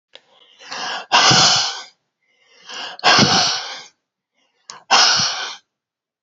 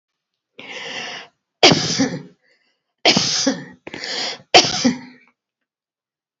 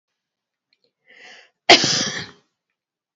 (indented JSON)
{
  "exhalation_length": "6.2 s",
  "exhalation_amplitude": 32768,
  "exhalation_signal_mean_std_ratio": 0.48,
  "three_cough_length": "6.4 s",
  "three_cough_amplitude": 31303,
  "three_cough_signal_mean_std_ratio": 0.39,
  "cough_length": "3.2 s",
  "cough_amplitude": 30707,
  "cough_signal_mean_std_ratio": 0.26,
  "survey_phase": "beta (2021-08-13 to 2022-03-07)",
  "age": "65+",
  "gender": "Female",
  "wearing_mask": "No",
  "symptom_none": true,
  "smoker_status": "Never smoked",
  "respiratory_condition_asthma": false,
  "respiratory_condition_other": false,
  "recruitment_source": "REACT",
  "submission_delay": "1 day",
  "covid_test_result": "Negative",
  "covid_test_method": "RT-qPCR"
}